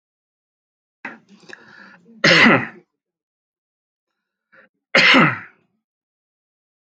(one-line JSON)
{"three_cough_length": "6.9 s", "three_cough_amplitude": 32768, "three_cough_signal_mean_std_ratio": 0.29, "survey_phase": "alpha (2021-03-01 to 2021-08-12)", "age": "18-44", "gender": "Male", "wearing_mask": "No", "symptom_none": true, "smoker_status": "Never smoked", "respiratory_condition_asthma": false, "respiratory_condition_other": false, "recruitment_source": "REACT", "submission_delay": "2 days", "covid_test_result": "Negative", "covid_test_method": "RT-qPCR"}